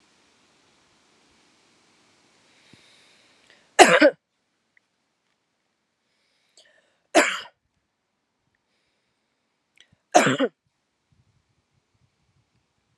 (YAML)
three_cough_length: 13.0 s
three_cough_amplitude: 32768
three_cough_signal_mean_std_ratio: 0.18
survey_phase: beta (2021-08-13 to 2022-03-07)
age: 45-64
gender: Female
wearing_mask: 'No'
symptom_runny_or_blocked_nose: true
symptom_shortness_of_breath: true
symptom_sore_throat: true
symptom_fatigue: true
symptom_change_to_sense_of_smell_or_taste: true
smoker_status: Never smoked
respiratory_condition_asthma: false
respiratory_condition_other: false
recruitment_source: Test and Trace
submission_delay: 2 days
covid_test_result: Positive
covid_test_method: RT-qPCR
covid_ct_value: 19.9
covid_ct_gene: S gene
covid_ct_mean: 20.9
covid_viral_load: 140000 copies/ml
covid_viral_load_category: Low viral load (10K-1M copies/ml)